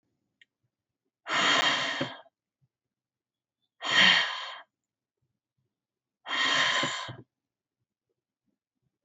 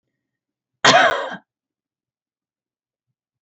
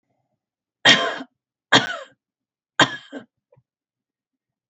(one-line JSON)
{"exhalation_length": "9.0 s", "exhalation_amplitude": 13011, "exhalation_signal_mean_std_ratio": 0.38, "cough_length": "3.4 s", "cough_amplitude": 32122, "cough_signal_mean_std_ratio": 0.26, "three_cough_length": "4.7 s", "three_cough_amplitude": 30486, "three_cough_signal_mean_std_ratio": 0.26, "survey_phase": "beta (2021-08-13 to 2022-03-07)", "age": "45-64", "gender": "Female", "wearing_mask": "No", "symptom_none": true, "symptom_onset": "8 days", "smoker_status": "Never smoked", "respiratory_condition_asthma": false, "respiratory_condition_other": false, "recruitment_source": "REACT", "submission_delay": "2 days", "covid_test_result": "Negative", "covid_test_method": "RT-qPCR"}